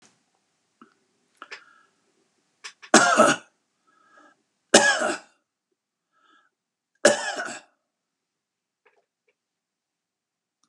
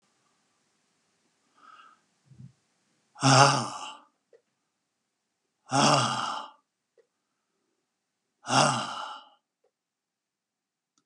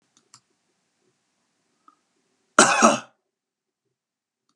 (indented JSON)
{
  "three_cough_length": "10.7 s",
  "three_cough_amplitude": 31372,
  "three_cough_signal_mean_std_ratio": 0.24,
  "exhalation_length": "11.1 s",
  "exhalation_amplitude": 27778,
  "exhalation_signal_mean_std_ratio": 0.29,
  "cough_length": "4.6 s",
  "cough_amplitude": 32768,
  "cough_signal_mean_std_ratio": 0.21,
  "survey_phase": "beta (2021-08-13 to 2022-03-07)",
  "age": "65+",
  "gender": "Male",
  "wearing_mask": "No",
  "symptom_none": true,
  "smoker_status": "Ex-smoker",
  "respiratory_condition_asthma": false,
  "respiratory_condition_other": false,
  "recruitment_source": "REACT",
  "submission_delay": "2 days",
  "covid_test_result": "Negative",
  "covid_test_method": "RT-qPCR"
}